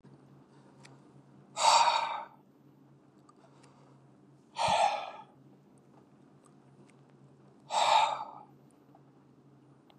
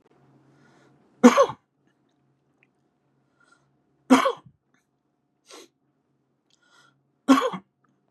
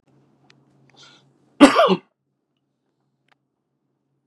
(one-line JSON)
{"exhalation_length": "10.0 s", "exhalation_amplitude": 9223, "exhalation_signal_mean_std_ratio": 0.35, "three_cough_length": "8.1 s", "three_cough_amplitude": 29343, "three_cough_signal_mean_std_ratio": 0.21, "cough_length": "4.3 s", "cough_amplitude": 32768, "cough_signal_mean_std_ratio": 0.2, "survey_phase": "beta (2021-08-13 to 2022-03-07)", "age": "45-64", "gender": "Male", "wearing_mask": "No", "symptom_none": true, "smoker_status": "Ex-smoker", "respiratory_condition_asthma": false, "respiratory_condition_other": false, "recruitment_source": "REACT", "submission_delay": "3 days", "covid_test_result": "Negative", "covid_test_method": "RT-qPCR", "influenza_a_test_result": "Unknown/Void", "influenza_b_test_result": "Unknown/Void"}